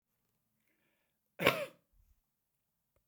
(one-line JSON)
{"cough_length": "3.1 s", "cough_amplitude": 10688, "cough_signal_mean_std_ratio": 0.19, "survey_phase": "beta (2021-08-13 to 2022-03-07)", "age": "65+", "gender": "Male", "wearing_mask": "No", "symptom_none": true, "smoker_status": "Ex-smoker", "respiratory_condition_asthma": false, "respiratory_condition_other": false, "recruitment_source": "REACT", "submission_delay": "5 days", "covid_test_result": "Negative", "covid_test_method": "RT-qPCR"}